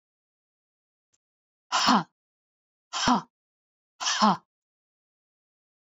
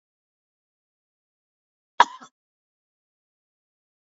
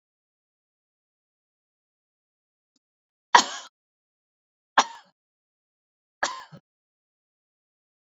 {
  "exhalation_length": "6.0 s",
  "exhalation_amplitude": 14170,
  "exhalation_signal_mean_std_ratio": 0.29,
  "cough_length": "4.1 s",
  "cough_amplitude": 31318,
  "cough_signal_mean_std_ratio": 0.08,
  "three_cough_length": "8.1 s",
  "three_cough_amplitude": 28543,
  "three_cough_signal_mean_std_ratio": 0.13,
  "survey_phase": "beta (2021-08-13 to 2022-03-07)",
  "age": "45-64",
  "gender": "Female",
  "wearing_mask": "No",
  "symptom_none": true,
  "smoker_status": "Never smoked",
  "respiratory_condition_asthma": true,
  "respiratory_condition_other": false,
  "recruitment_source": "REACT",
  "submission_delay": "1 day",
  "covid_test_result": "Negative",
  "covid_test_method": "RT-qPCR"
}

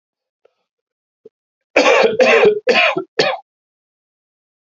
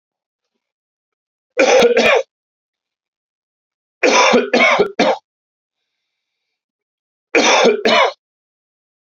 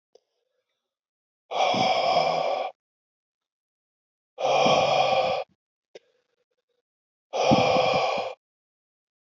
{
  "cough_length": "4.8 s",
  "cough_amplitude": 31610,
  "cough_signal_mean_std_ratio": 0.43,
  "three_cough_length": "9.1 s",
  "three_cough_amplitude": 32767,
  "three_cough_signal_mean_std_ratio": 0.42,
  "exhalation_length": "9.2 s",
  "exhalation_amplitude": 15375,
  "exhalation_signal_mean_std_ratio": 0.5,
  "survey_phase": "beta (2021-08-13 to 2022-03-07)",
  "age": "45-64",
  "gender": "Male",
  "wearing_mask": "No",
  "symptom_cough_any": true,
  "symptom_runny_or_blocked_nose": true,
  "symptom_fever_high_temperature": true,
  "symptom_headache": true,
  "symptom_other": true,
  "symptom_onset": "2 days",
  "smoker_status": "Never smoked",
  "respiratory_condition_asthma": false,
  "respiratory_condition_other": false,
  "recruitment_source": "Test and Trace",
  "submission_delay": "1 day",
  "covid_test_result": "Positive",
  "covid_test_method": "RT-qPCR",
  "covid_ct_value": 17.4,
  "covid_ct_gene": "ORF1ab gene",
  "covid_ct_mean": 18.4,
  "covid_viral_load": "900000 copies/ml",
  "covid_viral_load_category": "Low viral load (10K-1M copies/ml)"
}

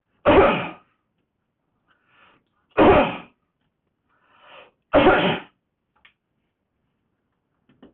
{
  "three_cough_length": "7.9 s",
  "three_cough_amplitude": 17589,
  "three_cough_signal_mean_std_ratio": 0.32,
  "survey_phase": "beta (2021-08-13 to 2022-03-07)",
  "age": "65+",
  "gender": "Male",
  "wearing_mask": "No",
  "symptom_none": true,
  "smoker_status": "Ex-smoker",
  "respiratory_condition_asthma": false,
  "respiratory_condition_other": false,
  "recruitment_source": "REACT",
  "submission_delay": "6 days",
  "covid_test_result": "Negative",
  "covid_test_method": "RT-qPCR"
}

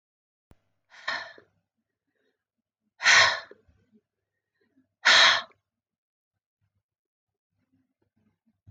{
  "exhalation_length": "8.7 s",
  "exhalation_amplitude": 19293,
  "exhalation_signal_mean_std_ratio": 0.23,
  "survey_phase": "beta (2021-08-13 to 2022-03-07)",
  "age": "65+",
  "gender": "Female",
  "wearing_mask": "No",
  "symptom_none": true,
  "smoker_status": "Ex-smoker",
  "respiratory_condition_asthma": false,
  "respiratory_condition_other": false,
  "recruitment_source": "REACT",
  "submission_delay": "1 day",
  "covid_test_result": "Negative",
  "covid_test_method": "RT-qPCR"
}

